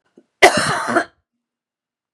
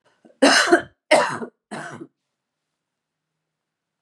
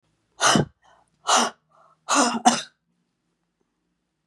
{
  "cough_length": "2.1 s",
  "cough_amplitude": 32768,
  "cough_signal_mean_std_ratio": 0.35,
  "three_cough_length": "4.0 s",
  "three_cough_amplitude": 28272,
  "three_cough_signal_mean_std_ratio": 0.32,
  "exhalation_length": "4.3 s",
  "exhalation_amplitude": 26947,
  "exhalation_signal_mean_std_ratio": 0.36,
  "survey_phase": "beta (2021-08-13 to 2022-03-07)",
  "age": "45-64",
  "gender": "Female",
  "wearing_mask": "No",
  "symptom_cough_any": true,
  "symptom_runny_or_blocked_nose": true,
  "smoker_status": "Never smoked",
  "respiratory_condition_asthma": false,
  "respiratory_condition_other": false,
  "recruitment_source": "Test and Trace",
  "submission_delay": "1 day",
  "covid_test_result": "Negative",
  "covid_test_method": "RT-qPCR"
}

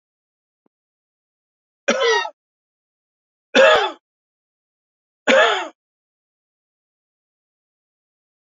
{
  "three_cough_length": "8.4 s",
  "three_cough_amplitude": 30457,
  "three_cough_signal_mean_std_ratio": 0.28,
  "survey_phase": "beta (2021-08-13 to 2022-03-07)",
  "age": "65+",
  "gender": "Male",
  "wearing_mask": "No",
  "symptom_cough_any": true,
  "symptom_runny_or_blocked_nose": true,
  "symptom_headache": true,
  "smoker_status": "Never smoked",
  "respiratory_condition_asthma": false,
  "respiratory_condition_other": false,
  "recruitment_source": "Test and Trace",
  "submission_delay": "3 days",
  "covid_test_result": "Positive",
  "covid_test_method": "RT-qPCR",
  "covid_ct_value": 17.0,
  "covid_ct_gene": "N gene"
}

